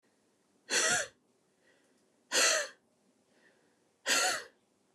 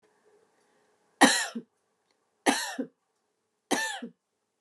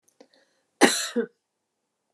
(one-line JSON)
{"exhalation_length": "4.9 s", "exhalation_amplitude": 6550, "exhalation_signal_mean_std_ratio": 0.38, "three_cough_length": "4.6 s", "three_cough_amplitude": 23475, "three_cough_signal_mean_std_ratio": 0.29, "cough_length": "2.1 s", "cough_amplitude": 27793, "cough_signal_mean_std_ratio": 0.27, "survey_phase": "beta (2021-08-13 to 2022-03-07)", "age": "45-64", "gender": "Female", "wearing_mask": "No", "symptom_fatigue": true, "symptom_onset": "12 days", "smoker_status": "Never smoked", "respiratory_condition_asthma": true, "respiratory_condition_other": false, "recruitment_source": "REACT", "submission_delay": "2 days", "covid_test_result": "Negative", "covid_test_method": "RT-qPCR"}